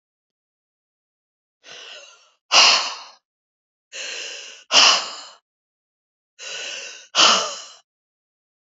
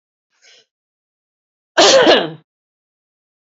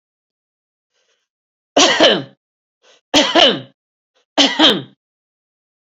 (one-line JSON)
{"exhalation_length": "8.6 s", "exhalation_amplitude": 32198, "exhalation_signal_mean_std_ratio": 0.32, "cough_length": "3.4 s", "cough_amplitude": 30361, "cough_signal_mean_std_ratio": 0.32, "three_cough_length": "5.8 s", "three_cough_amplitude": 32354, "three_cough_signal_mean_std_ratio": 0.36, "survey_phase": "beta (2021-08-13 to 2022-03-07)", "age": "45-64", "gender": "Female", "wearing_mask": "No", "symptom_none": true, "smoker_status": "Never smoked", "respiratory_condition_asthma": false, "respiratory_condition_other": false, "recruitment_source": "REACT", "submission_delay": "6 days", "covid_test_result": "Negative", "covid_test_method": "RT-qPCR", "influenza_a_test_result": "Negative", "influenza_b_test_result": "Negative"}